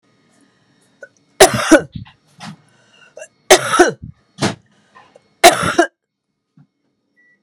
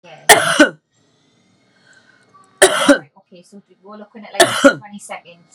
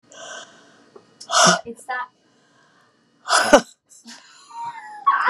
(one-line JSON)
{"three_cough_length": "7.4 s", "three_cough_amplitude": 32768, "three_cough_signal_mean_std_ratio": 0.29, "cough_length": "5.5 s", "cough_amplitude": 32768, "cough_signal_mean_std_ratio": 0.34, "exhalation_length": "5.3 s", "exhalation_amplitude": 32767, "exhalation_signal_mean_std_ratio": 0.36, "survey_phase": "beta (2021-08-13 to 2022-03-07)", "age": "45-64", "gender": "Female", "wearing_mask": "No", "symptom_cough_any": true, "smoker_status": "Never smoked", "respiratory_condition_asthma": false, "respiratory_condition_other": false, "recruitment_source": "REACT", "submission_delay": "1 day", "covid_test_result": "Negative", "covid_test_method": "RT-qPCR"}